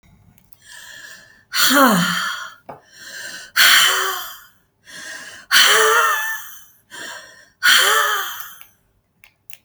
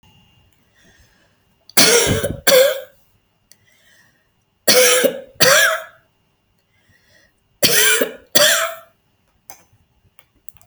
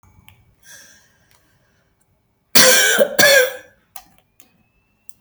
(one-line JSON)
{"exhalation_length": "9.6 s", "exhalation_amplitude": 32768, "exhalation_signal_mean_std_ratio": 0.5, "three_cough_length": "10.7 s", "three_cough_amplitude": 32768, "three_cough_signal_mean_std_ratio": 0.4, "cough_length": "5.2 s", "cough_amplitude": 32768, "cough_signal_mean_std_ratio": 0.34, "survey_phase": "beta (2021-08-13 to 2022-03-07)", "age": "65+", "gender": "Female", "wearing_mask": "No", "symptom_none": true, "smoker_status": "Never smoked", "respiratory_condition_asthma": false, "respiratory_condition_other": false, "recruitment_source": "REACT", "submission_delay": "1 day", "covid_test_result": "Negative", "covid_test_method": "RT-qPCR"}